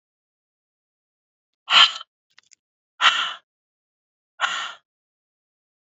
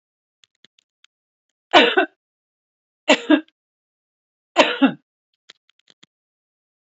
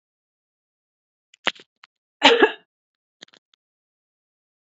{
  "exhalation_length": "6.0 s",
  "exhalation_amplitude": 32768,
  "exhalation_signal_mean_std_ratio": 0.24,
  "three_cough_length": "6.8 s",
  "three_cough_amplitude": 32767,
  "three_cough_signal_mean_std_ratio": 0.24,
  "cough_length": "4.6 s",
  "cough_amplitude": 32071,
  "cough_signal_mean_std_ratio": 0.18,
  "survey_phase": "beta (2021-08-13 to 2022-03-07)",
  "age": "45-64",
  "gender": "Female",
  "wearing_mask": "No",
  "symptom_none": true,
  "symptom_onset": "12 days",
  "smoker_status": "Never smoked",
  "respiratory_condition_asthma": false,
  "respiratory_condition_other": false,
  "recruitment_source": "REACT",
  "submission_delay": "-2 days",
  "covid_test_result": "Negative",
  "covid_test_method": "RT-qPCR",
  "influenza_a_test_result": "Negative",
  "influenza_b_test_result": "Negative"
}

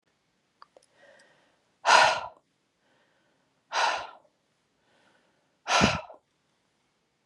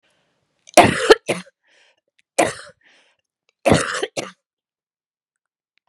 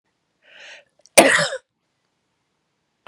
{
  "exhalation_length": "7.3 s",
  "exhalation_amplitude": 19931,
  "exhalation_signal_mean_std_ratio": 0.28,
  "three_cough_length": "5.9 s",
  "three_cough_amplitude": 32768,
  "three_cough_signal_mean_std_ratio": 0.27,
  "cough_length": "3.1 s",
  "cough_amplitude": 32768,
  "cough_signal_mean_std_ratio": 0.24,
  "survey_phase": "beta (2021-08-13 to 2022-03-07)",
  "age": "45-64",
  "gender": "Female",
  "wearing_mask": "No",
  "symptom_cough_any": true,
  "symptom_sore_throat": true,
  "symptom_headache": true,
  "symptom_onset": "8 days",
  "smoker_status": "Never smoked",
  "respiratory_condition_asthma": false,
  "respiratory_condition_other": false,
  "recruitment_source": "REACT",
  "submission_delay": "2 days",
  "covid_test_result": "Negative",
  "covid_test_method": "RT-qPCR"
}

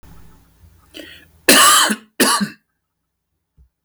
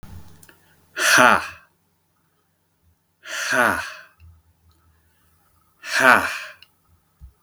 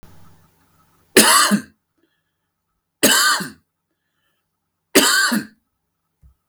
{
  "cough_length": "3.8 s",
  "cough_amplitude": 32768,
  "cough_signal_mean_std_ratio": 0.39,
  "exhalation_length": "7.4 s",
  "exhalation_amplitude": 32766,
  "exhalation_signal_mean_std_ratio": 0.33,
  "three_cough_length": "6.5 s",
  "three_cough_amplitude": 32768,
  "three_cough_signal_mean_std_ratio": 0.37,
  "survey_phase": "beta (2021-08-13 to 2022-03-07)",
  "age": "45-64",
  "gender": "Male",
  "wearing_mask": "No",
  "symptom_cough_any": true,
  "smoker_status": "Never smoked",
  "respiratory_condition_asthma": false,
  "respiratory_condition_other": false,
  "recruitment_source": "REACT",
  "submission_delay": "2 days",
  "covid_test_result": "Negative",
  "covid_test_method": "RT-qPCR",
  "influenza_a_test_result": "Negative",
  "influenza_b_test_result": "Negative"
}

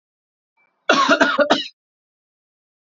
{
  "cough_length": "2.8 s",
  "cough_amplitude": 28754,
  "cough_signal_mean_std_ratio": 0.39,
  "survey_phase": "alpha (2021-03-01 to 2021-08-12)",
  "age": "18-44",
  "gender": "Male",
  "wearing_mask": "Yes",
  "symptom_cough_any": true,
  "symptom_fatigue": true,
  "symptom_headache": true,
  "symptom_change_to_sense_of_smell_or_taste": true,
  "symptom_loss_of_taste": true,
  "smoker_status": "Prefer not to say",
  "respiratory_condition_asthma": false,
  "respiratory_condition_other": false,
  "recruitment_source": "Test and Trace",
  "submission_delay": "2 days",
  "covid_test_result": "Positive",
  "covid_test_method": "RT-qPCR"
}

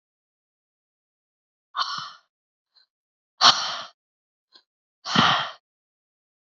{
  "exhalation_length": "6.6 s",
  "exhalation_amplitude": 30051,
  "exhalation_signal_mean_std_ratio": 0.26,
  "survey_phase": "beta (2021-08-13 to 2022-03-07)",
  "age": "45-64",
  "gender": "Female",
  "wearing_mask": "No",
  "symptom_none": true,
  "smoker_status": "Current smoker (e-cigarettes or vapes only)",
  "respiratory_condition_asthma": false,
  "respiratory_condition_other": false,
  "recruitment_source": "REACT",
  "submission_delay": "4 days",
  "covid_test_result": "Negative",
  "covid_test_method": "RT-qPCR",
  "influenza_a_test_result": "Unknown/Void",
  "influenza_b_test_result": "Unknown/Void"
}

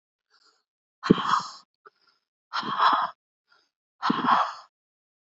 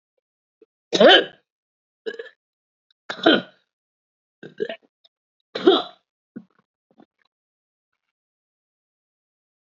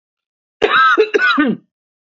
{
  "exhalation_length": "5.4 s",
  "exhalation_amplitude": 27371,
  "exhalation_signal_mean_std_ratio": 0.37,
  "three_cough_length": "9.7 s",
  "three_cough_amplitude": 27594,
  "three_cough_signal_mean_std_ratio": 0.21,
  "cough_length": "2.0 s",
  "cough_amplitude": 27896,
  "cough_signal_mean_std_ratio": 0.58,
  "survey_phase": "beta (2021-08-13 to 2022-03-07)",
  "age": "45-64",
  "gender": "Female",
  "wearing_mask": "No",
  "symptom_cough_any": true,
  "symptom_runny_or_blocked_nose": true,
  "symptom_shortness_of_breath": true,
  "symptom_sore_throat": true,
  "symptom_fatigue": true,
  "symptom_headache": true,
  "symptom_onset": "3 days",
  "smoker_status": "Prefer not to say",
  "respiratory_condition_asthma": false,
  "respiratory_condition_other": false,
  "recruitment_source": "Test and Trace",
  "submission_delay": "1 day",
  "covid_test_result": "Positive",
  "covid_test_method": "RT-qPCR",
  "covid_ct_value": 23.5,
  "covid_ct_gene": "N gene"
}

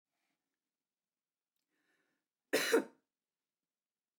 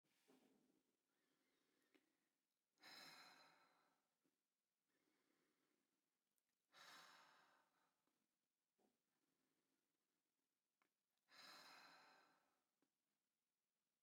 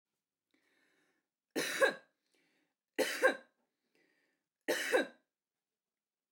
{
  "cough_length": "4.2 s",
  "cough_amplitude": 4211,
  "cough_signal_mean_std_ratio": 0.2,
  "exhalation_length": "14.0 s",
  "exhalation_amplitude": 79,
  "exhalation_signal_mean_std_ratio": 0.42,
  "three_cough_length": "6.3 s",
  "three_cough_amplitude": 6063,
  "three_cough_signal_mean_std_ratio": 0.29,
  "survey_phase": "beta (2021-08-13 to 2022-03-07)",
  "age": "45-64",
  "gender": "Female",
  "wearing_mask": "No",
  "symptom_none": true,
  "smoker_status": "Never smoked",
  "respiratory_condition_asthma": false,
  "respiratory_condition_other": false,
  "recruitment_source": "REACT",
  "submission_delay": "2 days",
  "covid_test_result": "Negative",
  "covid_test_method": "RT-qPCR",
  "influenza_a_test_result": "Unknown/Void",
  "influenza_b_test_result": "Unknown/Void"
}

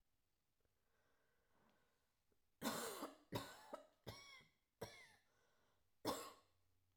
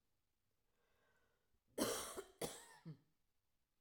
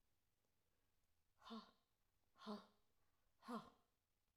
{
  "three_cough_length": "7.0 s",
  "three_cough_amplitude": 1291,
  "three_cough_signal_mean_std_ratio": 0.37,
  "cough_length": "3.8 s",
  "cough_amplitude": 1455,
  "cough_signal_mean_std_ratio": 0.34,
  "exhalation_length": "4.4 s",
  "exhalation_amplitude": 351,
  "exhalation_signal_mean_std_ratio": 0.35,
  "survey_phase": "alpha (2021-03-01 to 2021-08-12)",
  "age": "45-64",
  "gender": "Female",
  "wearing_mask": "No",
  "symptom_none": true,
  "smoker_status": "Ex-smoker",
  "respiratory_condition_asthma": false,
  "respiratory_condition_other": false,
  "recruitment_source": "REACT",
  "submission_delay": "1 day",
  "covid_test_result": "Negative",
  "covid_test_method": "RT-qPCR"
}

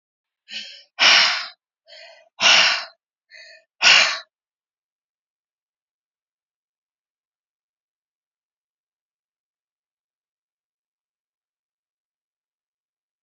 {
  "exhalation_length": "13.2 s",
  "exhalation_amplitude": 28885,
  "exhalation_signal_mean_std_ratio": 0.23,
  "survey_phase": "beta (2021-08-13 to 2022-03-07)",
  "age": "65+",
  "gender": "Female",
  "wearing_mask": "No",
  "symptom_none": true,
  "smoker_status": "Ex-smoker",
  "respiratory_condition_asthma": false,
  "respiratory_condition_other": false,
  "recruitment_source": "REACT",
  "submission_delay": "1 day",
  "covid_test_result": "Negative",
  "covid_test_method": "RT-qPCR"
}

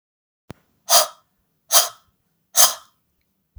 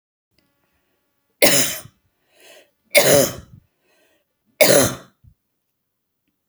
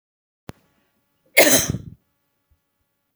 {
  "exhalation_length": "3.6 s",
  "exhalation_amplitude": 32768,
  "exhalation_signal_mean_std_ratio": 0.28,
  "three_cough_length": "6.5 s",
  "three_cough_amplitude": 32768,
  "three_cough_signal_mean_std_ratio": 0.31,
  "cough_length": "3.2 s",
  "cough_amplitude": 32768,
  "cough_signal_mean_std_ratio": 0.25,
  "survey_phase": "beta (2021-08-13 to 2022-03-07)",
  "age": "45-64",
  "gender": "Female",
  "wearing_mask": "No",
  "symptom_none": true,
  "smoker_status": "Ex-smoker",
  "respiratory_condition_asthma": false,
  "respiratory_condition_other": false,
  "recruitment_source": "REACT",
  "submission_delay": "2 days",
  "covid_test_result": "Negative",
  "covid_test_method": "RT-qPCR"
}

